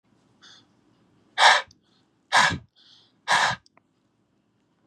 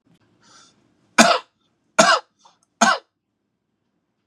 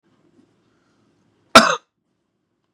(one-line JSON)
{"exhalation_length": "4.9 s", "exhalation_amplitude": 23622, "exhalation_signal_mean_std_ratio": 0.3, "three_cough_length": "4.3 s", "three_cough_amplitude": 32768, "three_cough_signal_mean_std_ratio": 0.28, "cough_length": "2.7 s", "cough_amplitude": 32768, "cough_signal_mean_std_ratio": 0.18, "survey_phase": "beta (2021-08-13 to 2022-03-07)", "age": "45-64", "gender": "Male", "wearing_mask": "No", "symptom_none": true, "smoker_status": "Ex-smoker", "respiratory_condition_asthma": false, "respiratory_condition_other": false, "recruitment_source": "REACT", "submission_delay": "4 days", "covid_test_result": "Negative", "covid_test_method": "RT-qPCR", "influenza_a_test_result": "Negative", "influenza_b_test_result": "Negative"}